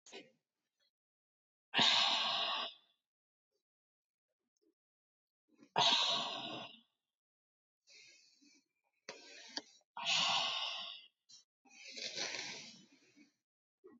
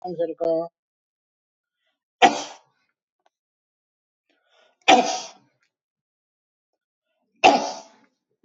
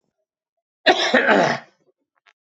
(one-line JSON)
{"exhalation_length": "14.0 s", "exhalation_amplitude": 4374, "exhalation_signal_mean_std_ratio": 0.38, "three_cough_length": "8.4 s", "three_cough_amplitude": 28176, "three_cough_signal_mean_std_ratio": 0.26, "cough_length": "2.6 s", "cough_amplitude": 25771, "cough_signal_mean_std_ratio": 0.41, "survey_phase": "beta (2021-08-13 to 2022-03-07)", "age": "45-64", "gender": "Male", "wearing_mask": "No", "symptom_none": true, "smoker_status": "Ex-smoker", "respiratory_condition_asthma": false, "respiratory_condition_other": false, "recruitment_source": "REACT", "submission_delay": "2 days", "covid_test_result": "Negative", "covid_test_method": "RT-qPCR", "influenza_a_test_result": "Negative", "influenza_b_test_result": "Negative"}